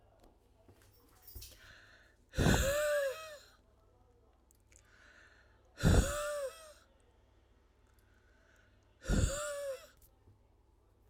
{"exhalation_length": "11.1 s", "exhalation_amplitude": 5709, "exhalation_signal_mean_std_ratio": 0.37, "survey_phase": "beta (2021-08-13 to 2022-03-07)", "age": "45-64", "gender": "Female", "wearing_mask": "No", "symptom_sore_throat": true, "symptom_headache": true, "symptom_onset": "12 days", "smoker_status": "Ex-smoker", "respiratory_condition_asthma": false, "respiratory_condition_other": false, "recruitment_source": "REACT", "submission_delay": "1 day", "covid_test_result": "Negative", "covid_test_method": "RT-qPCR"}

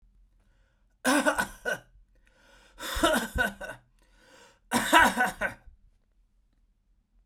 {"three_cough_length": "7.3 s", "three_cough_amplitude": 18972, "three_cough_signal_mean_std_ratio": 0.38, "survey_phase": "beta (2021-08-13 to 2022-03-07)", "age": "45-64", "gender": "Male", "wearing_mask": "No", "symptom_cough_any": true, "symptom_runny_or_blocked_nose": true, "symptom_sore_throat": true, "symptom_fatigue": true, "symptom_headache": true, "symptom_other": true, "symptom_onset": "4 days", "smoker_status": "Ex-smoker", "respiratory_condition_asthma": false, "respiratory_condition_other": false, "recruitment_source": "Test and Trace", "submission_delay": "1 day", "covid_test_result": "Positive", "covid_test_method": "ePCR"}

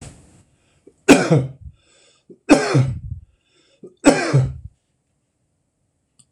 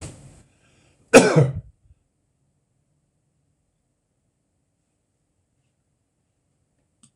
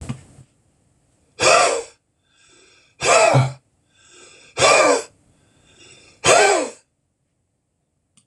{"three_cough_length": "6.3 s", "three_cough_amplitude": 26028, "three_cough_signal_mean_std_ratio": 0.35, "cough_length": "7.2 s", "cough_amplitude": 26028, "cough_signal_mean_std_ratio": 0.17, "exhalation_length": "8.3 s", "exhalation_amplitude": 25880, "exhalation_signal_mean_std_ratio": 0.39, "survey_phase": "beta (2021-08-13 to 2022-03-07)", "age": "65+", "gender": "Male", "wearing_mask": "No", "symptom_none": true, "smoker_status": "Never smoked", "respiratory_condition_asthma": true, "respiratory_condition_other": false, "recruitment_source": "REACT", "submission_delay": "1 day", "covid_test_result": "Negative", "covid_test_method": "RT-qPCR", "influenza_a_test_result": "Negative", "influenza_b_test_result": "Negative"}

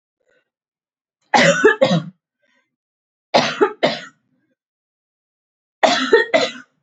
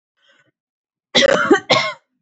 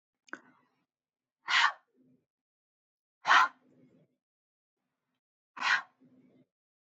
{"three_cough_length": "6.8 s", "three_cough_amplitude": 32767, "three_cough_signal_mean_std_ratio": 0.38, "cough_length": "2.2 s", "cough_amplitude": 30747, "cough_signal_mean_std_ratio": 0.42, "exhalation_length": "6.9 s", "exhalation_amplitude": 11113, "exhalation_signal_mean_std_ratio": 0.23, "survey_phase": "beta (2021-08-13 to 2022-03-07)", "age": "18-44", "gender": "Female", "wearing_mask": "No", "symptom_none": true, "smoker_status": "Ex-smoker", "respiratory_condition_asthma": false, "respiratory_condition_other": false, "recruitment_source": "REACT", "submission_delay": "2 days", "covid_test_result": "Negative", "covid_test_method": "RT-qPCR"}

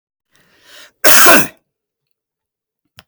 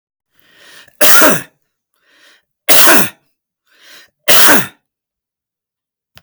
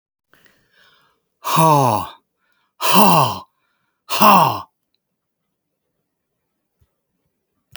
{"cough_length": "3.1 s", "cough_amplitude": 32768, "cough_signal_mean_std_ratio": 0.33, "three_cough_length": "6.2 s", "three_cough_amplitude": 32768, "three_cough_signal_mean_std_ratio": 0.39, "exhalation_length": "7.8 s", "exhalation_amplitude": 32768, "exhalation_signal_mean_std_ratio": 0.35, "survey_phase": "beta (2021-08-13 to 2022-03-07)", "age": "65+", "gender": "Male", "wearing_mask": "No", "symptom_none": true, "smoker_status": "Never smoked", "respiratory_condition_asthma": false, "respiratory_condition_other": false, "recruitment_source": "REACT", "submission_delay": "9 days", "covid_test_result": "Negative", "covid_test_method": "RT-qPCR"}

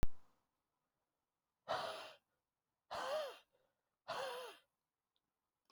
{"exhalation_length": "5.7 s", "exhalation_amplitude": 2201, "exhalation_signal_mean_std_ratio": 0.31, "survey_phase": "beta (2021-08-13 to 2022-03-07)", "age": "18-44", "gender": "Male", "wearing_mask": "No", "symptom_cough_any": true, "symptom_runny_or_blocked_nose": true, "symptom_fatigue": true, "symptom_change_to_sense_of_smell_or_taste": true, "symptom_loss_of_taste": true, "symptom_other": true, "smoker_status": "Never smoked", "respiratory_condition_asthma": false, "respiratory_condition_other": false, "recruitment_source": "Test and Trace", "submission_delay": "2 days", "covid_test_result": "Positive", "covid_test_method": "RT-qPCR", "covid_ct_value": 28.4, "covid_ct_gene": "ORF1ab gene"}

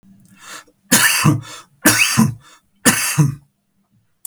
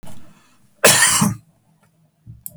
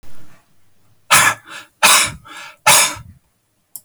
{"three_cough_length": "4.3 s", "three_cough_amplitude": 32768, "three_cough_signal_mean_std_ratio": 0.48, "cough_length": "2.6 s", "cough_amplitude": 32768, "cough_signal_mean_std_ratio": 0.41, "exhalation_length": "3.8 s", "exhalation_amplitude": 32768, "exhalation_signal_mean_std_ratio": 0.42, "survey_phase": "beta (2021-08-13 to 2022-03-07)", "age": "65+", "gender": "Male", "wearing_mask": "No", "symptom_none": true, "smoker_status": "Never smoked", "respiratory_condition_asthma": false, "respiratory_condition_other": false, "recruitment_source": "REACT", "submission_delay": "1 day", "covid_test_result": "Negative", "covid_test_method": "RT-qPCR", "influenza_a_test_result": "Negative", "influenza_b_test_result": "Negative"}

